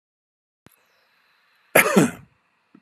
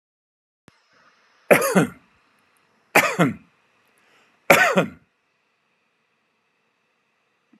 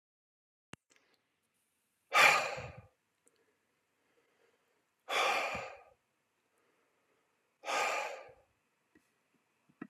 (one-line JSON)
{"cough_length": "2.8 s", "cough_amplitude": 31437, "cough_signal_mean_std_ratio": 0.26, "three_cough_length": "7.6 s", "three_cough_amplitude": 32768, "three_cough_signal_mean_std_ratio": 0.27, "exhalation_length": "9.9 s", "exhalation_amplitude": 9611, "exhalation_signal_mean_std_ratio": 0.28, "survey_phase": "alpha (2021-03-01 to 2021-08-12)", "age": "65+", "gender": "Male", "wearing_mask": "No", "symptom_none": true, "smoker_status": "Ex-smoker", "respiratory_condition_asthma": false, "respiratory_condition_other": false, "recruitment_source": "REACT", "submission_delay": "2 days", "covid_test_result": "Negative", "covid_test_method": "RT-qPCR"}